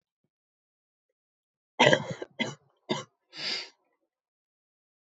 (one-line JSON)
{"cough_length": "5.1 s", "cough_amplitude": 23082, "cough_signal_mean_std_ratio": 0.24, "survey_phase": "alpha (2021-03-01 to 2021-08-12)", "age": "18-44", "gender": "Female", "wearing_mask": "No", "symptom_cough_any": true, "symptom_fatigue": true, "symptom_fever_high_temperature": true, "symptom_headache": true, "symptom_onset": "4 days", "smoker_status": "Never smoked", "respiratory_condition_asthma": false, "respiratory_condition_other": false, "recruitment_source": "Test and Trace", "submission_delay": "2 days", "covid_test_result": "Positive", "covid_test_method": "RT-qPCR", "covid_ct_value": 16.0, "covid_ct_gene": "ORF1ab gene", "covid_ct_mean": 16.6, "covid_viral_load": "3700000 copies/ml", "covid_viral_load_category": "High viral load (>1M copies/ml)"}